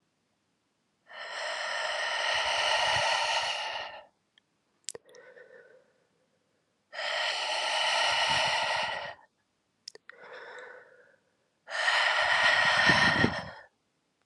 {"exhalation_length": "14.3 s", "exhalation_amplitude": 11197, "exhalation_signal_mean_std_ratio": 0.59, "survey_phase": "alpha (2021-03-01 to 2021-08-12)", "age": "18-44", "gender": "Female", "wearing_mask": "No", "symptom_new_continuous_cough": true, "symptom_fatigue": true, "symptom_headache": true, "smoker_status": "Never smoked", "respiratory_condition_asthma": true, "respiratory_condition_other": false, "recruitment_source": "Test and Trace", "submission_delay": "1 day", "covid_test_result": "Positive", "covid_test_method": "RT-qPCR", "covid_ct_value": 28.6, "covid_ct_gene": "ORF1ab gene"}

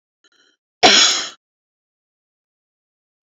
{"cough_length": "3.2 s", "cough_amplitude": 32120, "cough_signal_mean_std_ratio": 0.27, "survey_phase": "beta (2021-08-13 to 2022-03-07)", "age": "45-64", "gender": "Female", "wearing_mask": "No", "symptom_none": true, "smoker_status": "Never smoked", "respiratory_condition_asthma": false, "respiratory_condition_other": false, "recruitment_source": "REACT", "submission_delay": "15 days", "covid_test_result": "Negative", "covid_test_method": "RT-qPCR", "influenza_a_test_result": "Negative", "influenza_b_test_result": "Negative"}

